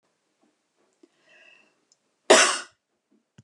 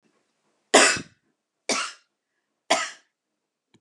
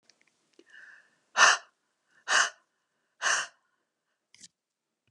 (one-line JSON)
{"cough_length": "3.4 s", "cough_amplitude": 25578, "cough_signal_mean_std_ratio": 0.21, "three_cough_length": "3.8 s", "three_cough_amplitude": 30004, "three_cough_signal_mean_std_ratio": 0.28, "exhalation_length": "5.1 s", "exhalation_amplitude": 17459, "exhalation_signal_mean_std_ratio": 0.26, "survey_phase": "beta (2021-08-13 to 2022-03-07)", "age": "45-64", "gender": "Female", "wearing_mask": "No", "symptom_none": true, "smoker_status": "Never smoked", "respiratory_condition_asthma": false, "respiratory_condition_other": false, "recruitment_source": "REACT", "submission_delay": "0 days", "covid_test_result": "Negative", "covid_test_method": "RT-qPCR"}